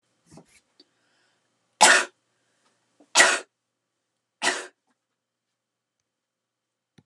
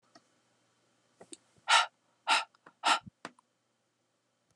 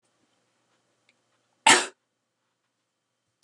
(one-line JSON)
{"three_cough_length": "7.1 s", "three_cough_amplitude": 30958, "three_cough_signal_mean_std_ratio": 0.22, "exhalation_length": "4.6 s", "exhalation_amplitude": 9440, "exhalation_signal_mean_std_ratio": 0.26, "cough_length": "3.4 s", "cough_amplitude": 27787, "cough_signal_mean_std_ratio": 0.17, "survey_phase": "beta (2021-08-13 to 2022-03-07)", "age": "18-44", "gender": "Female", "wearing_mask": "No", "symptom_none": true, "smoker_status": "Never smoked", "respiratory_condition_asthma": false, "respiratory_condition_other": false, "recruitment_source": "REACT", "submission_delay": "0 days", "covid_test_result": "Negative", "covid_test_method": "RT-qPCR"}